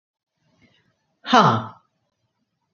{"exhalation_length": "2.7 s", "exhalation_amplitude": 27879, "exhalation_signal_mean_std_ratio": 0.26, "survey_phase": "beta (2021-08-13 to 2022-03-07)", "age": "65+", "gender": "Female", "wearing_mask": "No", "symptom_none": true, "smoker_status": "Ex-smoker", "respiratory_condition_asthma": false, "respiratory_condition_other": false, "recruitment_source": "REACT", "submission_delay": "0 days", "covid_test_result": "Negative", "covid_test_method": "RT-qPCR", "influenza_a_test_result": "Negative", "influenza_b_test_result": "Negative"}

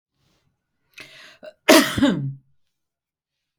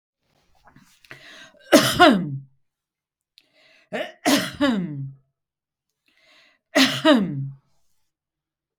{"cough_length": "3.6 s", "cough_amplitude": 32768, "cough_signal_mean_std_ratio": 0.29, "three_cough_length": "8.8 s", "three_cough_amplitude": 32768, "three_cough_signal_mean_std_ratio": 0.35, "survey_phase": "beta (2021-08-13 to 2022-03-07)", "age": "45-64", "gender": "Female", "wearing_mask": "No", "symptom_cough_any": true, "symptom_sore_throat": true, "symptom_fatigue": true, "smoker_status": "Ex-smoker", "respiratory_condition_asthma": false, "respiratory_condition_other": false, "recruitment_source": "Test and Trace", "submission_delay": "2 days", "covid_test_result": "Negative", "covid_test_method": "RT-qPCR"}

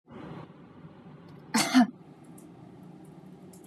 {"cough_length": "3.7 s", "cough_amplitude": 10001, "cough_signal_mean_std_ratio": 0.34, "survey_phase": "beta (2021-08-13 to 2022-03-07)", "age": "18-44", "gender": "Female", "wearing_mask": "No", "symptom_none": true, "smoker_status": "Never smoked", "respiratory_condition_asthma": false, "respiratory_condition_other": false, "recruitment_source": "REACT", "submission_delay": "1 day", "covid_test_result": "Negative", "covid_test_method": "RT-qPCR", "influenza_a_test_result": "Unknown/Void", "influenza_b_test_result": "Unknown/Void"}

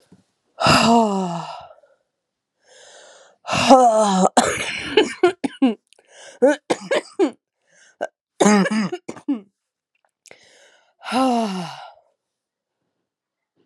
{"exhalation_length": "13.7 s", "exhalation_amplitude": 32756, "exhalation_signal_mean_std_ratio": 0.43, "survey_phase": "alpha (2021-03-01 to 2021-08-12)", "age": "18-44", "gender": "Female", "wearing_mask": "No", "symptom_cough_any": true, "symptom_fatigue": true, "symptom_fever_high_temperature": true, "symptom_headache": true, "smoker_status": "Ex-smoker", "respiratory_condition_asthma": false, "respiratory_condition_other": false, "recruitment_source": "Test and Trace", "submission_delay": "1 day", "covid_test_result": "Positive", "covid_test_method": "RT-qPCR", "covid_ct_value": 12.3, "covid_ct_gene": "ORF1ab gene", "covid_ct_mean": 12.8, "covid_viral_load": "64000000 copies/ml", "covid_viral_load_category": "High viral load (>1M copies/ml)"}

